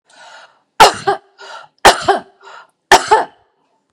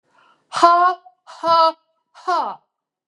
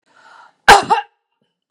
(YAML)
three_cough_length: 3.9 s
three_cough_amplitude: 32768
three_cough_signal_mean_std_ratio: 0.34
exhalation_length: 3.1 s
exhalation_amplitude: 32231
exhalation_signal_mean_std_ratio: 0.44
cough_length: 1.7 s
cough_amplitude: 32768
cough_signal_mean_std_ratio: 0.29
survey_phase: beta (2021-08-13 to 2022-03-07)
age: 45-64
gender: Female
wearing_mask: 'No'
symptom_headache: true
smoker_status: Never smoked
respiratory_condition_asthma: false
respiratory_condition_other: false
recruitment_source: Test and Trace
submission_delay: 2 days
covid_test_result: Positive
covid_test_method: RT-qPCR